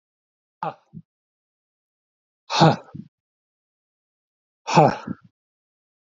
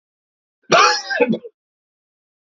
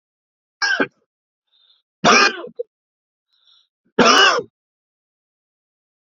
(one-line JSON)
{"exhalation_length": "6.1 s", "exhalation_amplitude": 32768, "exhalation_signal_mean_std_ratio": 0.23, "cough_length": "2.5 s", "cough_amplitude": 29106, "cough_signal_mean_std_ratio": 0.37, "three_cough_length": "6.1 s", "three_cough_amplitude": 32767, "three_cough_signal_mean_std_ratio": 0.32, "survey_phase": "alpha (2021-03-01 to 2021-08-12)", "age": "18-44", "gender": "Male", "wearing_mask": "No", "symptom_cough_any": true, "symptom_onset": "4 days", "smoker_status": "Never smoked", "respiratory_condition_asthma": false, "respiratory_condition_other": false, "recruitment_source": "Test and Trace", "submission_delay": "2 days", "covid_test_result": "Positive", "covid_test_method": "RT-qPCR"}